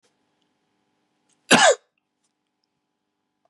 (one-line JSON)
{"cough_length": "3.5 s", "cough_amplitude": 27637, "cough_signal_mean_std_ratio": 0.21, "survey_phase": "beta (2021-08-13 to 2022-03-07)", "age": "45-64", "gender": "Male", "wearing_mask": "No", "symptom_cough_any": true, "symptom_runny_or_blocked_nose": true, "symptom_fatigue": true, "symptom_fever_high_temperature": true, "symptom_headache": true, "symptom_change_to_sense_of_smell_or_taste": true, "symptom_onset": "4 days", "smoker_status": "Ex-smoker", "respiratory_condition_asthma": false, "respiratory_condition_other": false, "recruitment_source": "Test and Trace", "submission_delay": "1 day", "covid_test_result": "Positive", "covid_test_method": "RT-qPCR", "covid_ct_value": 13.8, "covid_ct_gene": "ORF1ab gene", "covid_ct_mean": 14.0, "covid_viral_load": "25000000 copies/ml", "covid_viral_load_category": "High viral load (>1M copies/ml)"}